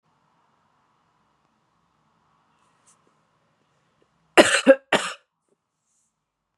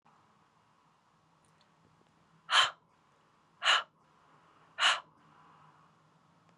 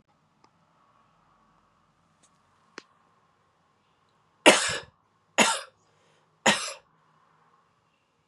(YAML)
cough_length: 6.6 s
cough_amplitude: 32767
cough_signal_mean_std_ratio: 0.18
exhalation_length: 6.6 s
exhalation_amplitude: 7857
exhalation_signal_mean_std_ratio: 0.25
three_cough_length: 8.3 s
three_cough_amplitude: 30842
three_cough_signal_mean_std_ratio: 0.21
survey_phase: beta (2021-08-13 to 2022-03-07)
age: 45-64
gender: Female
wearing_mask: 'No'
symptom_runny_or_blocked_nose: true
symptom_shortness_of_breath: true
symptom_sore_throat: true
symptom_fatigue: true
symptom_headache: true
symptom_change_to_sense_of_smell_or_taste: true
smoker_status: Never smoked
respiratory_condition_asthma: false
respiratory_condition_other: false
recruitment_source: Test and Trace
submission_delay: 2 days
covid_test_result: Positive
covid_test_method: ePCR